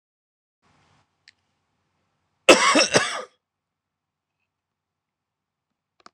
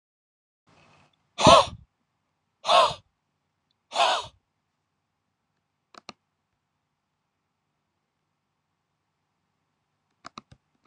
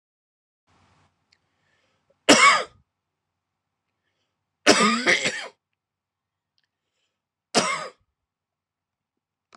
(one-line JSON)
{"cough_length": "6.1 s", "cough_amplitude": 26028, "cough_signal_mean_std_ratio": 0.22, "exhalation_length": "10.9 s", "exhalation_amplitude": 24892, "exhalation_signal_mean_std_ratio": 0.2, "three_cough_length": "9.6 s", "three_cough_amplitude": 26028, "three_cough_signal_mean_std_ratio": 0.26, "survey_phase": "beta (2021-08-13 to 2022-03-07)", "age": "18-44", "gender": "Male", "wearing_mask": "No", "symptom_fatigue": true, "smoker_status": "Current smoker (11 or more cigarettes per day)", "respiratory_condition_asthma": false, "respiratory_condition_other": false, "recruitment_source": "REACT", "submission_delay": "0 days", "covid_test_result": "Negative", "covid_test_method": "RT-qPCR"}